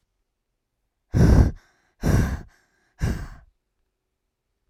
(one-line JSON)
{"exhalation_length": "4.7 s", "exhalation_amplitude": 23082, "exhalation_signal_mean_std_ratio": 0.35, "survey_phase": "alpha (2021-03-01 to 2021-08-12)", "age": "18-44", "gender": "Female", "wearing_mask": "No", "symptom_none": true, "smoker_status": "Never smoked", "respiratory_condition_asthma": false, "respiratory_condition_other": false, "recruitment_source": "REACT", "submission_delay": "1 day", "covid_test_result": "Negative", "covid_test_method": "RT-qPCR"}